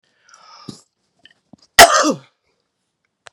{"cough_length": "3.3 s", "cough_amplitude": 32768, "cough_signal_mean_std_ratio": 0.24, "survey_phase": "beta (2021-08-13 to 2022-03-07)", "age": "65+", "gender": "Female", "wearing_mask": "No", "symptom_cough_any": true, "symptom_runny_or_blocked_nose": true, "smoker_status": "Never smoked", "respiratory_condition_asthma": false, "respiratory_condition_other": false, "recruitment_source": "REACT", "submission_delay": "0 days", "covid_test_result": "Positive", "covid_test_method": "RT-qPCR", "covid_ct_value": 22.4, "covid_ct_gene": "E gene", "influenza_a_test_result": "Negative", "influenza_b_test_result": "Negative"}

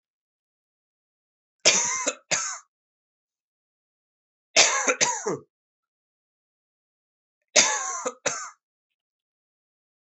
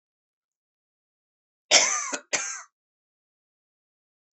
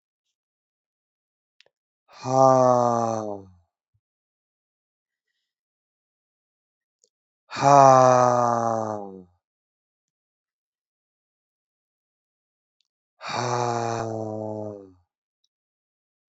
{"three_cough_length": "10.2 s", "three_cough_amplitude": 31109, "three_cough_signal_mean_std_ratio": 0.31, "cough_length": "4.4 s", "cough_amplitude": 24341, "cough_signal_mean_std_ratio": 0.25, "exhalation_length": "16.3 s", "exhalation_amplitude": 26239, "exhalation_signal_mean_std_ratio": 0.3, "survey_phase": "alpha (2021-03-01 to 2021-08-12)", "age": "18-44", "gender": "Male", "wearing_mask": "No", "symptom_cough_any": true, "symptom_fatigue": true, "symptom_fever_high_temperature": true, "symptom_headache": true, "symptom_onset": "3 days", "smoker_status": "Never smoked", "respiratory_condition_asthma": false, "respiratory_condition_other": false, "recruitment_source": "Test and Trace", "submission_delay": "2 days", "covid_test_result": "Positive", "covid_test_method": "RT-qPCR"}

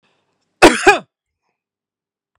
{"cough_length": "2.4 s", "cough_amplitude": 32768, "cough_signal_mean_std_ratio": 0.26, "survey_phase": "beta (2021-08-13 to 2022-03-07)", "age": "45-64", "gender": "Male", "wearing_mask": "No", "symptom_none": true, "symptom_onset": "13 days", "smoker_status": "Ex-smoker", "respiratory_condition_asthma": false, "respiratory_condition_other": false, "recruitment_source": "REACT", "submission_delay": "2 days", "covid_test_result": "Negative", "covid_test_method": "RT-qPCR"}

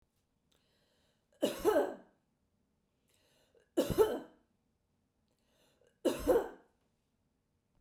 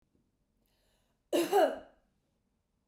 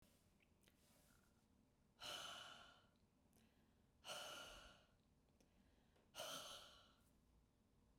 {"three_cough_length": "7.8 s", "three_cough_amplitude": 6386, "three_cough_signal_mean_std_ratio": 0.3, "cough_length": "2.9 s", "cough_amplitude": 5199, "cough_signal_mean_std_ratio": 0.3, "exhalation_length": "8.0 s", "exhalation_amplitude": 356, "exhalation_signal_mean_std_ratio": 0.52, "survey_phase": "beta (2021-08-13 to 2022-03-07)", "age": "18-44", "gender": "Female", "wearing_mask": "No", "symptom_none": true, "smoker_status": "Never smoked", "respiratory_condition_asthma": false, "respiratory_condition_other": false, "recruitment_source": "REACT", "submission_delay": "1 day", "covid_test_result": "Negative", "covid_test_method": "RT-qPCR", "influenza_a_test_result": "Negative", "influenza_b_test_result": "Negative"}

